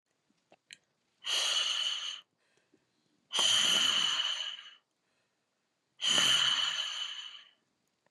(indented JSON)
{
  "exhalation_length": "8.1 s",
  "exhalation_amplitude": 8169,
  "exhalation_signal_mean_std_ratio": 0.55,
  "survey_phase": "beta (2021-08-13 to 2022-03-07)",
  "age": "45-64",
  "gender": "Female",
  "wearing_mask": "No",
  "symptom_none": true,
  "smoker_status": "Never smoked",
  "respiratory_condition_asthma": true,
  "respiratory_condition_other": false,
  "recruitment_source": "REACT",
  "submission_delay": "2 days",
  "covid_test_result": "Negative",
  "covid_test_method": "RT-qPCR",
  "influenza_a_test_result": "Negative",
  "influenza_b_test_result": "Negative"
}